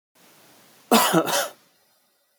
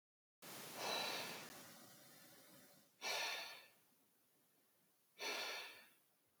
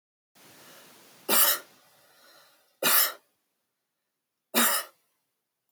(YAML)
cough_length: 2.4 s
cough_amplitude: 21036
cough_signal_mean_std_ratio: 0.38
exhalation_length: 6.4 s
exhalation_amplitude: 1020
exhalation_signal_mean_std_ratio: 0.55
three_cough_length: 5.7 s
three_cough_amplitude: 15003
three_cough_signal_mean_std_ratio: 0.32
survey_phase: alpha (2021-03-01 to 2021-08-12)
age: 18-44
gender: Male
wearing_mask: 'No'
symptom_none: true
smoker_status: Never smoked
respiratory_condition_asthma: true
respiratory_condition_other: false
recruitment_source: REACT
submission_delay: 1 day
covid_test_result: Negative
covid_test_method: RT-qPCR